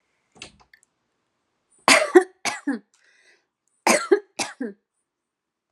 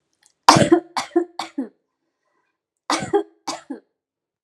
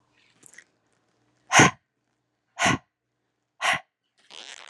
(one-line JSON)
{"three_cough_length": "5.7 s", "three_cough_amplitude": 30543, "three_cough_signal_mean_std_ratio": 0.27, "cough_length": "4.4 s", "cough_amplitude": 32768, "cough_signal_mean_std_ratio": 0.31, "exhalation_length": "4.7 s", "exhalation_amplitude": 28243, "exhalation_signal_mean_std_ratio": 0.25, "survey_phase": "alpha (2021-03-01 to 2021-08-12)", "age": "18-44", "gender": "Female", "wearing_mask": "No", "symptom_none": true, "smoker_status": "Never smoked", "respiratory_condition_asthma": false, "respiratory_condition_other": false, "recruitment_source": "REACT", "submission_delay": "1 day", "covid_test_result": "Negative", "covid_test_method": "RT-qPCR"}